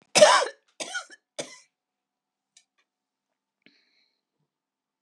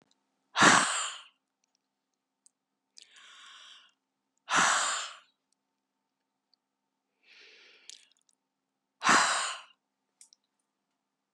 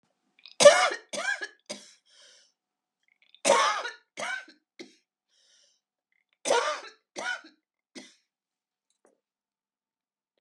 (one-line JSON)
{"cough_length": "5.0 s", "cough_amplitude": 27006, "cough_signal_mean_std_ratio": 0.21, "exhalation_length": "11.3 s", "exhalation_amplitude": 18087, "exhalation_signal_mean_std_ratio": 0.28, "three_cough_length": "10.4 s", "three_cough_amplitude": 26470, "three_cough_signal_mean_std_ratio": 0.26, "survey_phase": "beta (2021-08-13 to 2022-03-07)", "age": "65+", "gender": "Female", "wearing_mask": "No", "symptom_cough_any": true, "symptom_shortness_of_breath": true, "symptom_fatigue": true, "symptom_onset": "11 days", "smoker_status": "Ex-smoker", "respiratory_condition_asthma": false, "respiratory_condition_other": true, "recruitment_source": "REACT", "submission_delay": "0 days", "covid_test_result": "Negative", "covid_test_method": "RT-qPCR", "influenza_a_test_result": "Negative", "influenza_b_test_result": "Negative"}